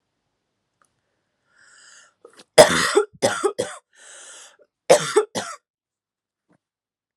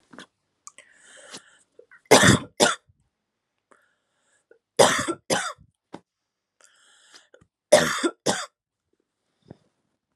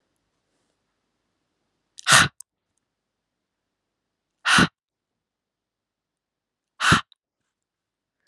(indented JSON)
{
  "cough_length": "7.2 s",
  "cough_amplitude": 32768,
  "cough_signal_mean_std_ratio": 0.27,
  "three_cough_length": "10.2 s",
  "three_cough_amplitude": 32672,
  "three_cough_signal_mean_std_ratio": 0.26,
  "exhalation_length": "8.3 s",
  "exhalation_amplitude": 31685,
  "exhalation_signal_mean_std_ratio": 0.21,
  "survey_phase": "alpha (2021-03-01 to 2021-08-12)",
  "age": "18-44",
  "gender": "Female",
  "wearing_mask": "No",
  "symptom_none": true,
  "smoker_status": "Ex-smoker",
  "respiratory_condition_asthma": false,
  "respiratory_condition_other": false,
  "recruitment_source": "REACT",
  "submission_delay": "2 days",
  "covid_test_result": "Negative",
  "covid_test_method": "RT-qPCR"
}